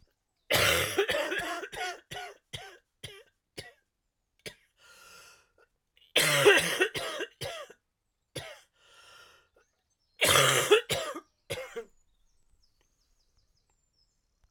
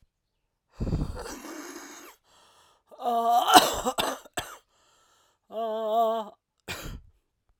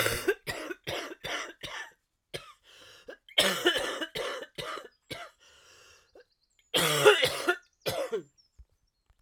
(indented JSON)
{
  "three_cough_length": "14.5 s",
  "three_cough_amplitude": 14415,
  "three_cough_signal_mean_std_ratio": 0.37,
  "exhalation_length": "7.6 s",
  "exhalation_amplitude": 32767,
  "exhalation_signal_mean_std_ratio": 0.43,
  "cough_length": "9.2 s",
  "cough_amplitude": 16731,
  "cough_signal_mean_std_ratio": 0.43,
  "survey_phase": "alpha (2021-03-01 to 2021-08-12)",
  "age": "45-64",
  "gender": "Female",
  "wearing_mask": "No",
  "symptom_cough_any": true,
  "symptom_shortness_of_breath": true,
  "symptom_fever_high_temperature": true,
  "symptom_change_to_sense_of_smell_or_taste": true,
  "symptom_loss_of_taste": true,
  "symptom_onset": "3 days",
  "smoker_status": "Never smoked",
  "respiratory_condition_asthma": false,
  "respiratory_condition_other": false,
  "recruitment_source": "Test and Trace",
  "submission_delay": "1 day",
  "covid_test_result": "Positive",
  "covid_test_method": "RT-qPCR",
  "covid_ct_value": 17.5,
  "covid_ct_gene": "ORF1ab gene",
  "covid_ct_mean": 17.9,
  "covid_viral_load": "1400000 copies/ml",
  "covid_viral_load_category": "High viral load (>1M copies/ml)"
}